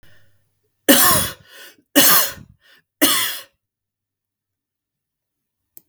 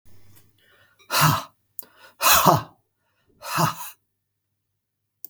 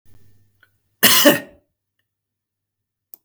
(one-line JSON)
{"three_cough_length": "5.9 s", "three_cough_amplitude": 32768, "three_cough_signal_mean_std_ratio": 0.35, "exhalation_length": "5.3 s", "exhalation_amplitude": 32766, "exhalation_signal_mean_std_ratio": 0.34, "cough_length": "3.2 s", "cough_amplitude": 32768, "cough_signal_mean_std_ratio": 0.27, "survey_phase": "beta (2021-08-13 to 2022-03-07)", "age": "18-44", "gender": "Male", "wearing_mask": "No", "symptom_none": true, "symptom_onset": "12 days", "smoker_status": "Never smoked", "respiratory_condition_asthma": false, "respiratory_condition_other": false, "recruitment_source": "REACT", "submission_delay": "0 days", "covid_test_result": "Negative", "covid_test_method": "RT-qPCR", "influenza_a_test_result": "Negative", "influenza_b_test_result": "Negative"}